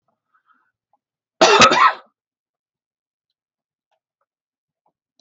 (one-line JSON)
{"cough_length": "5.2 s", "cough_amplitude": 32767, "cough_signal_mean_std_ratio": 0.25, "survey_phase": "beta (2021-08-13 to 2022-03-07)", "age": "65+", "gender": "Male", "wearing_mask": "No", "symptom_none": true, "smoker_status": "Never smoked", "respiratory_condition_asthma": false, "respiratory_condition_other": false, "recruitment_source": "REACT", "submission_delay": "1 day", "covid_test_result": "Negative", "covid_test_method": "RT-qPCR"}